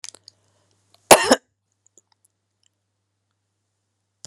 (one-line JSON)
{"cough_length": "4.3 s", "cough_amplitude": 32768, "cough_signal_mean_std_ratio": 0.15, "survey_phase": "beta (2021-08-13 to 2022-03-07)", "age": "65+", "gender": "Female", "wearing_mask": "No", "symptom_none": true, "smoker_status": "Never smoked", "respiratory_condition_asthma": false, "respiratory_condition_other": false, "recruitment_source": "REACT", "submission_delay": "1 day", "covid_test_result": "Negative", "covid_test_method": "RT-qPCR"}